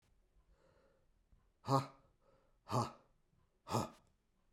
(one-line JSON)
{"exhalation_length": "4.5 s", "exhalation_amplitude": 3694, "exhalation_signal_mean_std_ratio": 0.28, "survey_phase": "beta (2021-08-13 to 2022-03-07)", "age": "18-44", "gender": "Male", "wearing_mask": "No", "symptom_cough_any": true, "symptom_runny_or_blocked_nose": true, "symptom_sore_throat": true, "symptom_abdominal_pain": true, "symptom_fever_high_temperature": true, "symptom_headache": true, "symptom_other": true, "symptom_onset": "2 days", "smoker_status": "Ex-smoker", "respiratory_condition_asthma": false, "respiratory_condition_other": false, "recruitment_source": "Test and Trace", "submission_delay": "1 day", "covid_test_result": "Positive", "covid_test_method": "ePCR"}